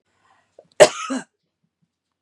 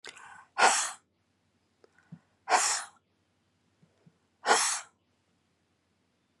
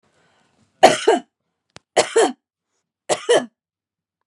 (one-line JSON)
{"cough_length": "2.2 s", "cough_amplitude": 32768, "cough_signal_mean_std_ratio": 0.2, "exhalation_length": "6.4 s", "exhalation_amplitude": 12243, "exhalation_signal_mean_std_ratio": 0.31, "three_cough_length": "4.3 s", "three_cough_amplitude": 32768, "three_cough_signal_mean_std_ratio": 0.32, "survey_phase": "beta (2021-08-13 to 2022-03-07)", "age": "45-64", "gender": "Female", "wearing_mask": "No", "symptom_runny_or_blocked_nose": true, "symptom_onset": "10 days", "smoker_status": "Never smoked", "respiratory_condition_asthma": false, "respiratory_condition_other": false, "recruitment_source": "REACT", "submission_delay": "1 day", "covid_test_result": "Negative", "covid_test_method": "RT-qPCR", "influenza_a_test_result": "Negative", "influenza_b_test_result": "Negative"}